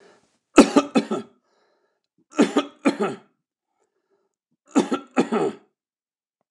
{"three_cough_length": "6.5 s", "three_cough_amplitude": 29204, "three_cough_signal_mean_std_ratio": 0.31, "survey_phase": "beta (2021-08-13 to 2022-03-07)", "age": "65+", "gender": "Male", "wearing_mask": "No", "symptom_none": true, "smoker_status": "Ex-smoker", "respiratory_condition_asthma": false, "respiratory_condition_other": false, "recruitment_source": "REACT", "submission_delay": "2 days", "covid_test_result": "Negative", "covid_test_method": "RT-qPCR", "influenza_a_test_result": "Negative", "influenza_b_test_result": "Negative"}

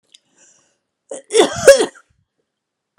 {"cough_length": "3.0 s", "cough_amplitude": 32768, "cough_signal_mean_std_ratio": 0.28, "survey_phase": "alpha (2021-03-01 to 2021-08-12)", "age": "45-64", "gender": "Female", "wearing_mask": "No", "symptom_fatigue": true, "symptom_headache": true, "symptom_change_to_sense_of_smell_or_taste": true, "symptom_loss_of_taste": true, "symptom_onset": "3 days", "smoker_status": "Never smoked", "respiratory_condition_asthma": false, "respiratory_condition_other": false, "recruitment_source": "Test and Trace", "submission_delay": "1 day", "covid_test_result": "Positive", "covid_test_method": "RT-qPCR", "covid_ct_value": 17.0, "covid_ct_gene": "ORF1ab gene", "covid_ct_mean": 17.5, "covid_viral_load": "1900000 copies/ml", "covid_viral_load_category": "High viral load (>1M copies/ml)"}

